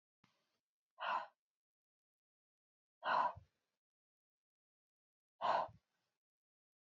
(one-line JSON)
{"exhalation_length": "6.8 s", "exhalation_amplitude": 1920, "exhalation_signal_mean_std_ratio": 0.27, "survey_phase": "beta (2021-08-13 to 2022-03-07)", "age": "18-44", "gender": "Female", "wearing_mask": "No", "symptom_cough_any": true, "symptom_runny_or_blocked_nose": true, "symptom_fatigue": true, "symptom_headache": true, "symptom_onset": "5 days", "smoker_status": "Never smoked", "respiratory_condition_asthma": false, "respiratory_condition_other": false, "recruitment_source": "REACT", "submission_delay": "3 days", "covid_test_result": "Negative", "covid_test_method": "RT-qPCR", "influenza_a_test_result": "Unknown/Void", "influenza_b_test_result": "Unknown/Void"}